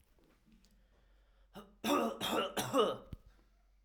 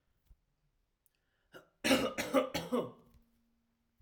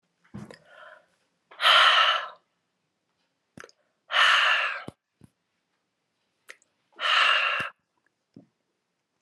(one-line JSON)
{"three_cough_length": "3.8 s", "three_cough_amplitude": 4963, "three_cough_signal_mean_std_ratio": 0.44, "cough_length": "4.0 s", "cough_amplitude": 6764, "cough_signal_mean_std_ratio": 0.35, "exhalation_length": "9.2 s", "exhalation_amplitude": 17183, "exhalation_signal_mean_std_ratio": 0.37, "survey_phase": "alpha (2021-03-01 to 2021-08-12)", "age": "18-44", "gender": "Male", "wearing_mask": "No", "symptom_fatigue": true, "symptom_change_to_sense_of_smell_or_taste": true, "symptom_loss_of_taste": true, "smoker_status": "Never smoked", "respiratory_condition_asthma": false, "respiratory_condition_other": false, "recruitment_source": "Test and Trace", "submission_delay": "0 days", "covid_test_result": "Positive", "covid_test_method": "LFT"}